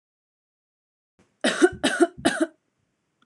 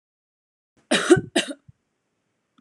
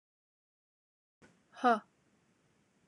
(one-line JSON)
{"three_cough_length": "3.3 s", "three_cough_amplitude": 23018, "three_cough_signal_mean_std_ratio": 0.33, "cough_length": "2.6 s", "cough_amplitude": 25392, "cough_signal_mean_std_ratio": 0.27, "exhalation_length": "2.9 s", "exhalation_amplitude": 5835, "exhalation_signal_mean_std_ratio": 0.18, "survey_phase": "alpha (2021-03-01 to 2021-08-12)", "age": "18-44", "gender": "Female", "wearing_mask": "No", "symptom_none": true, "smoker_status": "Never smoked", "respiratory_condition_asthma": false, "respiratory_condition_other": false, "recruitment_source": "REACT", "submission_delay": "1 day", "covid_test_result": "Negative", "covid_test_method": "RT-qPCR"}